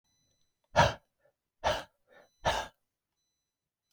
{"exhalation_length": "3.9 s", "exhalation_amplitude": 8808, "exhalation_signal_mean_std_ratio": 0.27, "survey_phase": "alpha (2021-03-01 to 2021-08-12)", "age": "45-64", "gender": "Male", "wearing_mask": "No", "symptom_none": true, "smoker_status": "Ex-smoker", "respiratory_condition_asthma": false, "respiratory_condition_other": false, "recruitment_source": "REACT", "submission_delay": "2 days", "covid_test_result": "Negative", "covid_test_method": "RT-qPCR"}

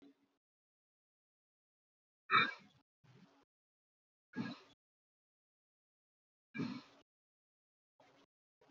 {"exhalation_length": "8.7 s", "exhalation_amplitude": 3969, "exhalation_signal_mean_std_ratio": 0.18, "survey_phase": "beta (2021-08-13 to 2022-03-07)", "age": "18-44", "gender": "Male", "wearing_mask": "No", "symptom_none": true, "symptom_onset": "12 days", "smoker_status": "Never smoked", "respiratory_condition_asthma": true, "respiratory_condition_other": false, "recruitment_source": "REACT", "submission_delay": "1 day", "covid_test_result": "Negative", "covid_test_method": "RT-qPCR"}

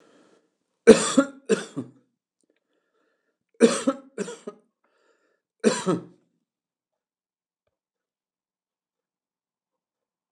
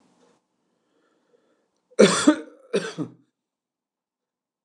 {"three_cough_length": "10.3 s", "three_cough_amplitude": 29204, "three_cough_signal_mean_std_ratio": 0.21, "cough_length": "4.6 s", "cough_amplitude": 28944, "cough_signal_mean_std_ratio": 0.24, "survey_phase": "alpha (2021-03-01 to 2021-08-12)", "age": "65+", "gender": "Male", "wearing_mask": "No", "symptom_none": true, "symptom_onset": "9 days", "smoker_status": "Never smoked", "respiratory_condition_asthma": false, "respiratory_condition_other": false, "recruitment_source": "REACT", "submission_delay": "6 days", "covid_test_result": "Negative", "covid_test_method": "RT-qPCR"}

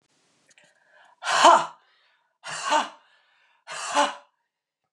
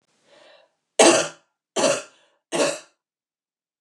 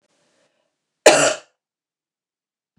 {"exhalation_length": "4.9 s", "exhalation_amplitude": 27166, "exhalation_signal_mean_std_ratio": 0.32, "three_cough_length": "3.8 s", "three_cough_amplitude": 29190, "three_cough_signal_mean_std_ratio": 0.33, "cough_length": "2.8 s", "cough_amplitude": 29204, "cough_signal_mean_std_ratio": 0.23, "survey_phase": "beta (2021-08-13 to 2022-03-07)", "age": "45-64", "gender": "Female", "wearing_mask": "No", "symptom_cough_any": true, "symptom_runny_or_blocked_nose": true, "symptom_fatigue": true, "symptom_other": true, "symptom_onset": "3 days", "smoker_status": "Never smoked", "respiratory_condition_asthma": false, "respiratory_condition_other": false, "recruitment_source": "Test and Trace", "submission_delay": "1 day", "covid_test_result": "Positive", "covid_test_method": "RT-qPCR", "covid_ct_value": 21.6, "covid_ct_gene": "ORF1ab gene", "covid_ct_mean": 21.8, "covid_viral_load": "69000 copies/ml", "covid_viral_load_category": "Low viral load (10K-1M copies/ml)"}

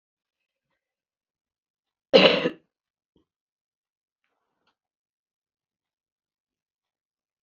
{"cough_length": "7.4 s", "cough_amplitude": 28896, "cough_signal_mean_std_ratio": 0.15, "survey_phase": "beta (2021-08-13 to 2022-03-07)", "age": "45-64", "gender": "Female", "wearing_mask": "No", "symptom_runny_or_blocked_nose": true, "symptom_headache": true, "symptom_change_to_sense_of_smell_or_taste": true, "smoker_status": "Current smoker (11 or more cigarettes per day)", "respiratory_condition_asthma": false, "respiratory_condition_other": false, "recruitment_source": "REACT", "submission_delay": "2 days", "covid_test_result": "Negative", "covid_test_method": "RT-qPCR"}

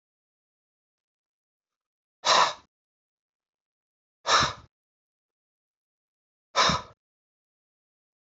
{"exhalation_length": "8.3 s", "exhalation_amplitude": 12479, "exhalation_signal_mean_std_ratio": 0.23, "survey_phase": "alpha (2021-03-01 to 2021-08-12)", "age": "65+", "gender": "Male", "wearing_mask": "No", "symptom_none": true, "smoker_status": "Ex-smoker", "respiratory_condition_asthma": false, "respiratory_condition_other": false, "recruitment_source": "REACT", "submission_delay": "2 days", "covid_test_result": "Negative", "covid_test_method": "RT-qPCR"}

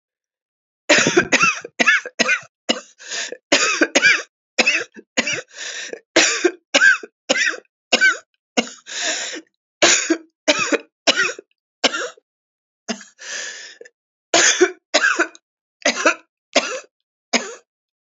{"three_cough_length": "18.2 s", "three_cough_amplitude": 32767, "three_cough_signal_mean_std_ratio": 0.46, "survey_phase": "alpha (2021-03-01 to 2021-08-12)", "age": "45-64", "gender": "Female", "wearing_mask": "No", "symptom_cough_any": true, "symptom_shortness_of_breath": true, "symptom_abdominal_pain": true, "symptom_fatigue": true, "symptom_headache": true, "symptom_change_to_sense_of_smell_or_taste": true, "symptom_loss_of_taste": true, "smoker_status": "Never smoked", "respiratory_condition_asthma": false, "respiratory_condition_other": false, "recruitment_source": "Test and Trace", "submission_delay": "1 day", "covid_test_result": "Positive", "covid_test_method": "ePCR"}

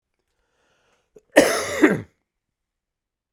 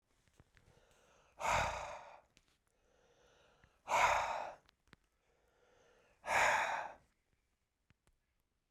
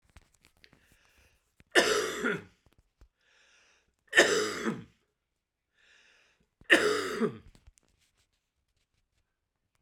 {"cough_length": "3.3 s", "cough_amplitude": 32768, "cough_signal_mean_std_ratio": 0.28, "exhalation_length": "8.7 s", "exhalation_amplitude": 4663, "exhalation_signal_mean_std_ratio": 0.36, "three_cough_length": "9.8 s", "three_cough_amplitude": 17052, "three_cough_signal_mean_std_ratio": 0.31, "survey_phase": "beta (2021-08-13 to 2022-03-07)", "age": "45-64", "gender": "Male", "wearing_mask": "Yes", "symptom_cough_any": true, "symptom_runny_or_blocked_nose": true, "symptom_sore_throat": true, "symptom_fatigue": true, "symptom_onset": "6 days", "smoker_status": "Never smoked", "respiratory_condition_asthma": false, "respiratory_condition_other": false, "recruitment_source": "Test and Trace", "submission_delay": "2 days", "covid_test_result": "Positive", "covid_test_method": "RT-qPCR", "covid_ct_value": 17.3, "covid_ct_gene": "ORF1ab gene", "covid_ct_mean": 17.7, "covid_viral_load": "1600000 copies/ml", "covid_viral_load_category": "High viral load (>1M copies/ml)"}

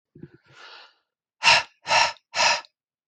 {"exhalation_length": "3.1 s", "exhalation_amplitude": 23531, "exhalation_signal_mean_std_ratio": 0.38, "survey_phase": "beta (2021-08-13 to 2022-03-07)", "age": "45-64", "gender": "Male", "wearing_mask": "No", "symptom_none": true, "smoker_status": "Never smoked", "respiratory_condition_asthma": false, "respiratory_condition_other": false, "recruitment_source": "REACT", "submission_delay": "3 days", "covid_test_result": "Negative", "covid_test_method": "RT-qPCR", "influenza_a_test_result": "Negative", "influenza_b_test_result": "Negative"}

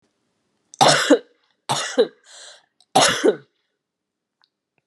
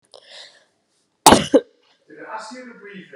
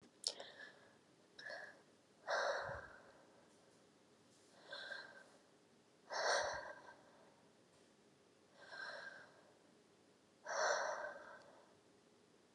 {"three_cough_length": "4.9 s", "three_cough_amplitude": 29443, "three_cough_signal_mean_std_ratio": 0.35, "cough_length": "3.2 s", "cough_amplitude": 32768, "cough_signal_mean_std_ratio": 0.25, "exhalation_length": "12.5 s", "exhalation_amplitude": 3581, "exhalation_signal_mean_std_ratio": 0.44, "survey_phase": "alpha (2021-03-01 to 2021-08-12)", "age": "45-64", "gender": "Female", "wearing_mask": "No", "symptom_cough_any": true, "symptom_new_continuous_cough": true, "symptom_fatigue": true, "symptom_headache": true, "symptom_change_to_sense_of_smell_or_taste": true, "symptom_loss_of_taste": true, "symptom_onset": "3 days", "smoker_status": "Never smoked", "respiratory_condition_asthma": false, "respiratory_condition_other": false, "recruitment_source": "Test and Trace", "submission_delay": "2 days", "covid_test_result": "Positive", "covid_test_method": "RT-qPCR"}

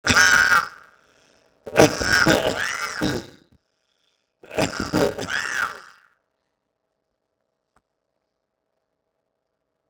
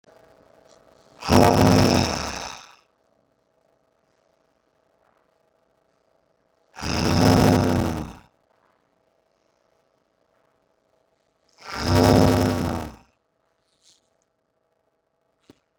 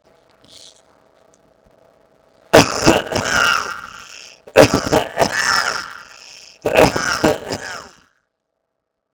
{"three_cough_length": "9.9 s", "three_cough_amplitude": 32210, "three_cough_signal_mean_std_ratio": 0.31, "exhalation_length": "15.8 s", "exhalation_amplitude": 26973, "exhalation_signal_mean_std_ratio": 0.28, "cough_length": "9.1 s", "cough_amplitude": 32768, "cough_signal_mean_std_ratio": 0.32, "survey_phase": "beta (2021-08-13 to 2022-03-07)", "age": "65+", "gender": "Male", "wearing_mask": "No", "symptom_none": true, "smoker_status": "Never smoked", "respiratory_condition_asthma": false, "respiratory_condition_other": false, "recruitment_source": "Test and Trace", "submission_delay": "2 days", "covid_test_result": "Negative", "covid_test_method": "RT-qPCR"}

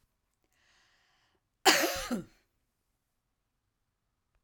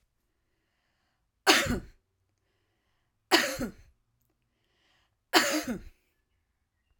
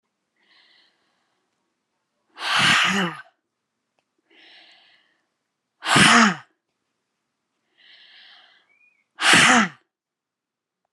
{"cough_length": "4.4 s", "cough_amplitude": 13523, "cough_signal_mean_std_ratio": 0.23, "three_cough_length": "7.0 s", "three_cough_amplitude": 18819, "three_cough_signal_mean_std_ratio": 0.28, "exhalation_length": "10.9 s", "exhalation_amplitude": 31707, "exhalation_signal_mean_std_ratio": 0.31, "survey_phase": "alpha (2021-03-01 to 2021-08-12)", "age": "45-64", "gender": "Female", "wearing_mask": "No", "symptom_none": true, "smoker_status": "Never smoked", "respiratory_condition_asthma": false, "respiratory_condition_other": false, "recruitment_source": "REACT", "submission_delay": "2 days", "covid_test_result": "Negative", "covid_test_method": "RT-qPCR"}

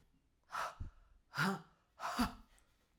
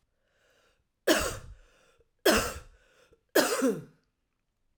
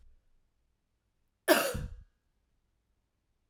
{"exhalation_length": "3.0 s", "exhalation_amplitude": 2624, "exhalation_signal_mean_std_ratio": 0.44, "three_cough_length": "4.8 s", "three_cough_amplitude": 12363, "three_cough_signal_mean_std_ratio": 0.35, "cough_length": "3.5 s", "cough_amplitude": 12939, "cough_signal_mean_std_ratio": 0.23, "survey_phase": "alpha (2021-03-01 to 2021-08-12)", "age": "45-64", "gender": "Female", "wearing_mask": "No", "symptom_cough_any": true, "symptom_shortness_of_breath": true, "symptom_fatigue": true, "symptom_fever_high_temperature": true, "symptom_headache": true, "symptom_change_to_sense_of_smell_or_taste": true, "symptom_onset": "3 days", "smoker_status": "Ex-smoker", "respiratory_condition_asthma": false, "respiratory_condition_other": false, "recruitment_source": "Test and Trace", "submission_delay": "2 days", "covid_test_result": "Positive", "covid_test_method": "RT-qPCR", "covid_ct_value": 21.7, "covid_ct_gene": "S gene", "covid_ct_mean": 22.3, "covid_viral_load": "50000 copies/ml", "covid_viral_load_category": "Low viral load (10K-1M copies/ml)"}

